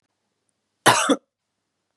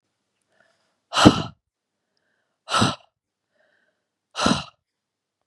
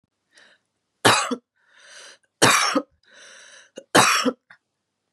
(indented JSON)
{
  "cough_length": "2.0 s",
  "cough_amplitude": 28084,
  "cough_signal_mean_std_ratio": 0.29,
  "exhalation_length": "5.5 s",
  "exhalation_amplitude": 32768,
  "exhalation_signal_mean_std_ratio": 0.25,
  "three_cough_length": "5.1 s",
  "three_cough_amplitude": 32325,
  "three_cough_signal_mean_std_ratio": 0.36,
  "survey_phase": "beta (2021-08-13 to 2022-03-07)",
  "age": "18-44",
  "gender": "Female",
  "wearing_mask": "No",
  "symptom_none": true,
  "smoker_status": "Never smoked",
  "respiratory_condition_asthma": false,
  "respiratory_condition_other": false,
  "recruitment_source": "REACT",
  "submission_delay": "1 day",
  "covid_test_result": "Negative",
  "covid_test_method": "RT-qPCR",
  "influenza_a_test_result": "Negative",
  "influenza_b_test_result": "Negative"
}